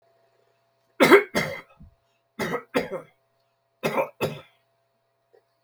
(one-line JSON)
{"cough_length": "5.6 s", "cough_amplitude": 26888, "cough_signal_mean_std_ratio": 0.29, "survey_phase": "beta (2021-08-13 to 2022-03-07)", "age": "65+", "gender": "Male", "wearing_mask": "No", "symptom_none": true, "smoker_status": "Never smoked", "respiratory_condition_asthma": false, "respiratory_condition_other": false, "recruitment_source": "REACT", "submission_delay": "5 days", "covid_test_result": "Negative", "covid_test_method": "RT-qPCR"}